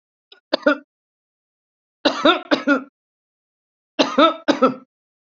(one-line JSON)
{"three_cough_length": "5.3 s", "three_cough_amplitude": 30064, "three_cough_signal_mean_std_ratio": 0.34, "survey_phase": "beta (2021-08-13 to 2022-03-07)", "age": "65+", "gender": "Female", "wearing_mask": "No", "symptom_none": true, "smoker_status": "Ex-smoker", "respiratory_condition_asthma": false, "respiratory_condition_other": false, "recruitment_source": "REACT", "submission_delay": "2 days", "covid_test_result": "Negative", "covid_test_method": "RT-qPCR"}